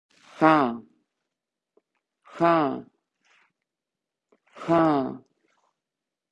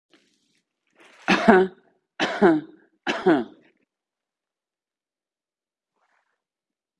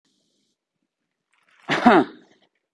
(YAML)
exhalation_length: 6.3 s
exhalation_amplitude: 19350
exhalation_signal_mean_std_ratio: 0.33
three_cough_length: 7.0 s
three_cough_amplitude: 27899
three_cough_signal_mean_std_ratio: 0.29
cough_length: 2.7 s
cough_amplitude: 28274
cough_signal_mean_std_ratio: 0.26
survey_phase: beta (2021-08-13 to 2022-03-07)
age: 45-64
gender: Female
wearing_mask: 'Yes'
symptom_sore_throat: true
symptom_fatigue: true
symptom_other: true
symptom_onset: 4 days
smoker_status: Never smoked
respiratory_condition_asthma: false
respiratory_condition_other: false
recruitment_source: Test and Trace
submission_delay: 2 days
covid_test_result: Positive
covid_test_method: RT-qPCR
covid_ct_value: 17.5
covid_ct_gene: N gene
covid_ct_mean: 18.4
covid_viral_load: 920000 copies/ml
covid_viral_load_category: Low viral load (10K-1M copies/ml)